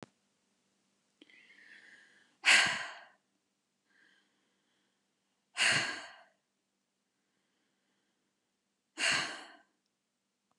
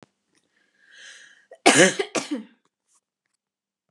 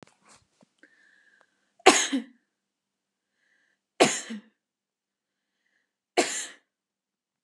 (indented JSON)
{
  "exhalation_length": "10.6 s",
  "exhalation_amplitude": 8566,
  "exhalation_signal_mean_std_ratio": 0.25,
  "cough_length": "3.9 s",
  "cough_amplitude": 32765,
  "cough_signal_mean_std_ratio": 0.26,
  "three_cough_length": "7.4 s",
  "three_cough_amplitude": 32757,
  "three_cough_signal_mean_std_ratio": 0.21,
  "survey_phase": "beta (2021-08-13 to 2022-03-07)",
  "age": "18-44",
  "gender": "Female",
  "wearing_mask": "No",
  "symptom_none": true,
  "smoker_status": "Never smoked",
  "respiratory_condition_asthma": true,
  "respiratory_condition_other": false,
  "recruitment_source": "REACT",
  "submission_delay": "1 day",
  "covid_test_result": "Negative",
  "covid_test_method": "RT-qPCR",
  "influenza_a_test_result": "Negative",
  "influenza_b_test_result": "Negative"
}